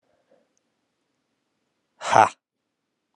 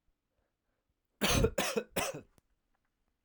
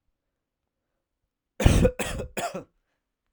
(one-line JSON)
{"exhalation_length": "3.2 s", "exhalation_amplitude": 29805, "exhalation_signal_mean_std_ratio": 0.17, "cough_length": "3.2 s", "cough_amplitude": 5592, "cough_signal_mean_std_ratio": 0.37, "three_cough_length": "3.3 s", "three_cough_amplitude": 30853, "three_cough_signal_mean_std_ratio": 0.31, "survey_phase": "alpha (2021-03-01 to 2021-08-12)", "age": "18-44", "gender": "Male", "wearing_mask": "No", "symptom_cough_any": true, "symptom_new_continuous_cough": true, "symptom_fatigue": true, "symptom_fever_high_temperature": true, "symptom_headache": true, "symptom_change_to_sense_of_smell_or_taste": true, "symptom_loss_of_taste": true, "symptom_onset": "3 days", "smoker_status": "Never smoked", "respiratory_condition_asthma": false, "respiratory_condition_other": false, "recruitment_source": "Test and Trace", "submission_delay": "2 days", "covid_test_result": "Positive", "covid_test_method": "RT-qPCR", "covid_ct_value": 21.5, "covid_ct_gene": "ORF1ab gene", "covid_ct_mean": 21.8, "covid_viral_load": "69000 copies/ml", "covid_viral_load_category": "Low viral load (10K-1M copies/ml)"}